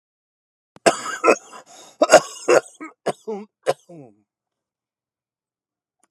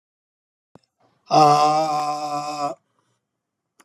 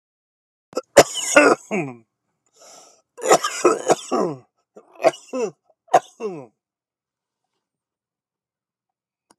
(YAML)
cough_length: 6.1 s
cough_amplitude: 32768
cough_signal_mean_std_ratio: 0.26
exhalation_length: 3.8 s
exhalation_amplitude: 22874
exhalation_signal_mean_std_ratio: 0.45
three_cough_length: 9.4 s
three_cough_amplitude: 32768
three_cough_signal_mean_std_ratio: 0.3
survey_phase: alpha (2021-03-01 to 2021-08-12)
age: 65+
gender: Male
wearing_mask: 'No'
symptom_cough_any: true
smoker_status: Ex-smoker
respiratory_condition_asthma: true
respiratory_condition_other: false
recruitment_source: REACT
submission_delay: 3 days
covid_test_result: Negative
covid_test_method: RT-qPCR